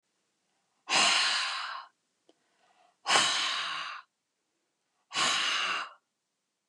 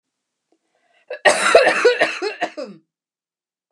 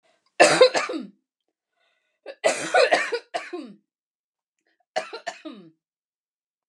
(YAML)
exhalation_length: 6.7 s
exhalation_amplitude: 12604
exhalation_signal_mean_std_ratio: 0.5
cough_length: 3.7 s
cough_amplitude: 32768
cough_signal_mean_std_ratio: 0.41
three_cough_length: 6.7 s
three_cough_amplitude: 28327
three_cough_signal_mean_std_ratio: 0.33
survey_phase: beta (2021-08-13 to 2022-03-07)
age: 45-64
gender: Female
wearing_mask: 'No'
symptom_none: true
symptom_onset: 13 days
smoker_status: Ex-smoker
respiratory_condition_asthma: false
respiratory_condition_other: false
recruitment_source: REACT
submission_delay: 2 days
covid_test_result: Negative
covid_test_method: RT-qPCR